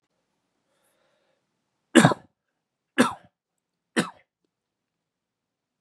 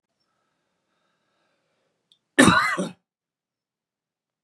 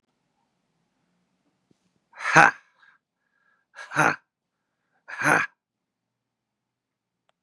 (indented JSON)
{
  "three_cough_length": "5.8 s",
  "three_cough_amplitude": 28041,
  "three_cough_signal_mean_std_ratio": 0.18,
  "cough_length": "4.4 s",
  "cough_amplitude": 32449,
  "cough_signal_mean_std_ratio": 0.23,
  "exhalation_length": "7.4 s",
  "exhalation_amplitude": 32767,
  "exhalation_signal_mean_std_ratio": 0.21,
  "survey_phase": "beta (2021-08-13 to 2022-03-07)",
  "age": "18-44",
  "gender": "Male",
  "wearing_mask": "No",
  "symptom_cough_any": true,
  "symptom_runny_or_blocked_nose": true,
  "symptom_sore_throat": true,
  "symptom_fever_high_temperature": true,
  "symptom_onset": "4 days",
  "smoker_status": "Ex-smoker",
  "respiratory_condition_asthma": false,
  "respiratory_condition_other": false,
  "recruitment_source": "Test and Trace",
  "submission_delay": "2 days",
  "covid_test_result": "Positive",
  "covid_test_method": "RT-qPCR",
  "covid_ct_value": 17.3,
  "covid_ct_gene": "N gene"
}